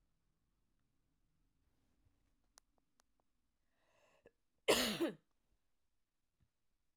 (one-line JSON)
{"cough_length": "7.0 s", "cough_amplitude": 3583, "cough_signal_mean_std_ratio": 0.19, "survey_phase": "alpha (2021-03-01 to 2021-08-12)", "age": "18-44", "gender": "Female", "wearing_mask": "No", "symptom_none": true, "smoker_status": "Never smoked", "respiratory_condition_asthma": false, "respiratory_condition_other": false, "recruitment_source": "REACT", "submission_delay": "1 day", "covid_test_result": "Negative", "covid_test_method": "RT-qPCR"}